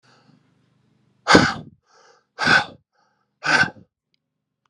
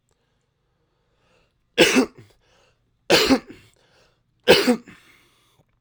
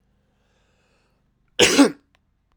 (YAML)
exhalation_length: 4.7 s
exhalation_amplitude: 32768
exhalation_signal_mean_std_ratio: 0.3
three_cough_length: 5.8 s
three_cough_amplitude: 32767
three_cough_signal_mean_std_ratio: 0.3
cough_length: 2.6 s
cough_amplitude: 32767
cough_signal_mean_std_ratio: 0.27
survey_phase: alpha (2021-03-01 to 2021-08-12)
age: 18-44
gender: Male
wearing_mask: 'No'
symptom_change_to_sense_of_smell_or_taste: true
symptom_loss_of_taste: true
symptom_onset: 3 days
smoker_status: Never smoked
respiratory_condition_asthma: false
respiratory_condition_other: false
recruitment_source: Test and Trace
submission_delay: 1 day
covid_test_result: Positive
covid_test_method: RT-qPCR
covid_ct_value: 20.0
covid_ct_gene: ORF1ab gene
covid_ct_mean: 20.4
covid_viral_load: 200000 copies/ml
covid_viral_load_category: Low viral load (10K-1M copies/ml)